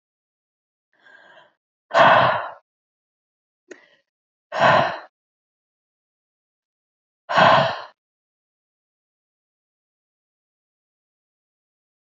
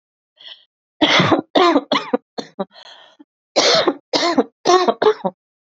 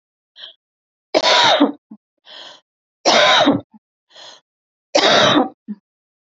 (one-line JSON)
{"exhalation_length": "12.0 s", "exhalation_amplitude": 26724, "exhalation_signal_mean_std_ratio": 0.26, "cough_length": "5.7 s", "cough_amplitude": 32530, "cough_signal_mean_std_ratio": 0.49, "three_cough_length": "6.3 s", "three_cough_amplitude": 32271, "three_cough_signal_mean_std_ratio": 0.44, "survey_phase": "alpha (2021-03-01 to 2021-08-12)", "age": "45-64", "gender": "Female", "wearing_mask": "No", "symptom_cough_any": true, "symptom_onset": "4 days", "smoker_status": "Ex-smoker", "respiratory_condition_asthma": false, "respiratory_condition_other": false, "recruitment_source": "Test and Trace", "submission_delay": "2 days", "covid_test_result": "Positive", "covid_test_method": "RT-qPCR", "covid_ct_value": 14.3, "covid_ct_gene": "N gene", "covid_ct_mean": 14.6, "covid_viral_load": "16000000 copies/ml", "covid_viral_load_category": "High viral load (>1M copies/ml)"}